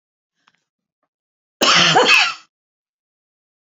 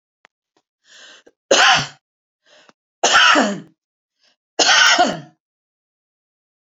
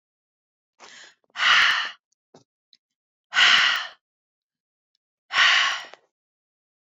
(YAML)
cough_length: 3.7 s
cough_amplitude: 29921
cough_signal_mean_std_ratio: 0.36
three_cough_length: 6.7 s
three_cough_amplitude: 32768
three_cough_signal_mean_std_ratio: 0.38
exhalation_length: 6.8 s
exhalation_amplitude: 22808
exhalation_signal_mean_std_ratio: 0.37
survey_phase: beta (2021-08-13 to 2022-03-07)
age: 45-64
gender: Female
wearing_mask: 'No'
symptom_none: true
smoker_status: Never smoked
respiratory_condition_asthma: false
respiratory_condition_other: false
recruitment_source: REACT
submission_delay: 1 day
covid_test_result: Negative
covid_test_method: RT-qPCR
influenza_a_test_result: Negative
influenza_b_test_result: Negative